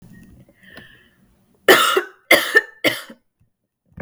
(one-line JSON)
{"three_cough_length": "4.0 s", "three_cough_amplitude": 32768, "three_cough_signal_mean_std_ratio": 0.33, "survey_phase": "beta (2021-08-13 to 2022-03-07)", "age": "18-44", "gender": "Female", "wearing_mask": "No", "symptom_runny_or_blocked_nose": true, "symptom_sore_throat": true, "symptom_headache": true, "smoker_status": "Never smoked", "respiratory_condition_asthma": false, "respiratory_condition_other": false, "recruitment_source": "Test and Trace", "submission_delay": "1 day", "covid_test_result": "Positive", "covid_test_method": "RT-qPCR", "covid_ct_value": 27.1, "covid_ct_gene": "ORF1ab gene"}